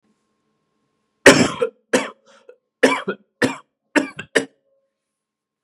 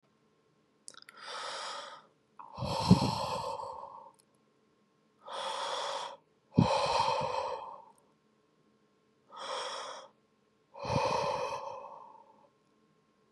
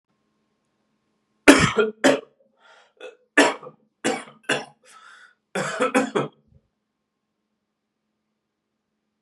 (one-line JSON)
{"cough_length": "5.6 s", "cough_amplitude": 32768, "cough_signal_mean_std_ratio": 0.28, "exhalation_length": "13.3 s", "exhalation_amplitude": 11681, "exhalation_signal_mean_std_ratio": 0.46, "three_cough_length": "9.2 s", "three_cough_amplitude": 32768, "three_cough_signal_mean_std_ratio": 0.29, "survey_phase": "beta (2021-08-13 to 2022-03-07)", "age": "18-44", "gender": "Male", "wearing_mask": "No", "symptom_cough_any": true, "smoker_status": "Never smoked", "respiratory_condition_asthma": false, "respiratory_condition_other": false, "recruitment_source": "REACT", "submission_delay": "4 days", "covid_test_result": "Negative", "covid_test_method": "RT-qPCR", "influenza_a_test_result": "Negative", "influenza_b_test_result": "Negative"}